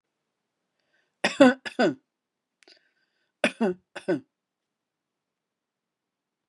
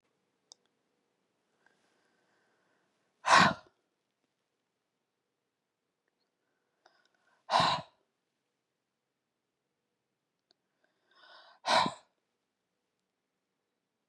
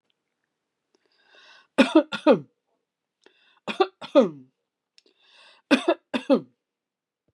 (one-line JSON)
{"cough_length": "6.5 s", "cough_amplitude": 21464, "cough_signal_mean_std_ratio": 0.23, "exhalation_length": "14.1 s", "exhalation_amplitude": 13218, "exhalation_signal_mean_std_ratio": 0.18, "three_cough_length": "7.3 s", "three_cough_amplitude": 24572, "three_cough_signal_mean_std_ratio": 0.27, "survey_phase": "beta (2021-08-13 to 2022-03-07)", "age": "65+", "gender": "Female", "wearing_mask": "No", "symptom_none": true, "smoker_status": "Ex-smoker", "respiratory_condition_asthma": false, "respiratory_condition_other": false, "recruitment_source": "REACT", "submission_delay": "3 days", "covid_test_result": "Negative", "covid_test_method": "RT-qPCR", "influenza_a_test_result": "Negative", "influenza_b_test_result": "Negative"}